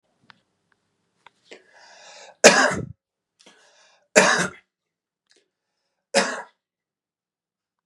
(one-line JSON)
{"three_cough_length": "7.9 s", "three_cough_amplitude": 32768, "three_cough_signal_mean_std_ratio": 0.24, "survey_phase": "beta (2021-08-13 to 2022-03-07)", "age": "18-44", "gender": "Male", "wearing_mask": "No", "symptom_cough_any": true, "smoker_status": "Never smoked", "respiratory_condition_asthma": false, "respiratory_condition_other": false, "recruitment_source": "REACT", "submission_delay": "1 day", "covid_test_result": "Negative", "covid_test_method": "RT-qPCR", "influenza_a_test_result": "Negative", "influenza_b_test_result": "Negative"}